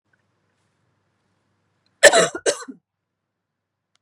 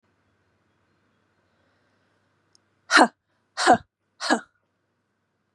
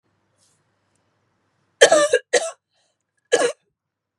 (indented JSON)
{
  "cough_length": "4.0 s",
  "cough_amplitude": 32768,
  "cough_signal_mean_std_ratio": 0.21,
  "exhalation_length": "5.5 s",
  "exhalation_amplitude": 24839,
  "exhalation_signal_mean_std_ratio": 0.22,
  "three_cough_length": "4.2 s",
  "three_cough_amplitude": 32768,
  "three_cough_signal_mean_std_ratio": 0.29,
  "survey_phase": "beta (2021-08-13 to 2022-03-07)",
  "age": "45-64",
  "gender": "Female",
  "wearing_mask": "No",
  "symptom_runny_or_blocked_nose": true,
  "symptom_onset": "11 days",
  "smoker_status": "Never smoked",
  "respiratory_condition_asthma": false,
  "respiratory_condition_other": false,
  "recruitment_source": "REACT",
  "submission_delay": "0 days",
  "covid_test_result": "Negative",
  "covid_test_method": "RT-qPCR",
  "influenza_a_test_result": "Negative",
  "influenza_b_test_result": "Negative"
}